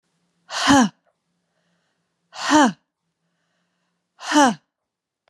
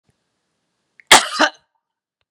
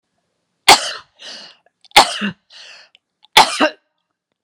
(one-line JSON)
{"exhalation_length": "5.3 s", "exhalation_amplitude": 26605, "exhalation_signal_mean_std_ratio": 0.32, "cough_length": "2.3 s", "cough_amplitude": 32768, "cough_signal_mean_std_ratio": 0.24, "three_cough_length": "4.4 s", "three_cough_amplitude": 32768, "three_cough_signal_mean_std_ratio": 0.29, "survey_phase": "beta (2021-08-13 to 2022-03-07)", "age": "45-64", "gender": "Female", "wearing_mask": "No", "symptom_none": true, "smoker_status": "Never smoked", "respiratory_condition_asthma": false, "respiratory_condition_other": false, "recruitment_source": "REACT", "submission_delay": "3 days", "covid_test_result": "Negative", "covid_test_method": "RT-qPCR"}